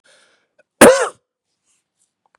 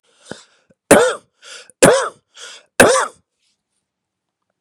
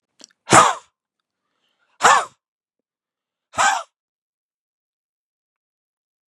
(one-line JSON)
{"cough_length": "2.4 s", "cough_amplitude": 32768, "cough_signal_mean_std_ratio": 0.25, "three_cough_length": "4.6 s", "three_cough_amplitude": 32768, "three_cough_signal_mean_std_ratio": 0.32, "exhalation_length": "6.3 s", "exhalation_amplitude": 32768, "exhalation_signal_mean_std_ratio": 0.24, "survey_phase": "beta (2021-08-13 to 2022-03-07)", "age": "18-44", "gender": "Male", "wearing_mask": "No", "symptom_runny_or_blocked_nose": true, "symptom_fatigue": true, "symptom_headache": true, "symptom_change_to_sense_of_smell_or_taste": true, "symptom_onset": "7 days", "smoker_status": "Ex-smoker", "respiratory_condition_asthma": false, "respiratory_condition_other": false, "recruitment_source": "Test and Trace", "submission_delay": "2 days", "covid_test_result": "Positive", "covid_test_method": "RT-qPCR", "covid_ct_value": 25.1, "covid_ct_gene": "ORF1ab gene", "covid_ct_mean": 25.5, "covid_viral_load": "4300 copies/ml", "covid_viral_load_category": "Minimal viral load (< 10K copies/ml)"}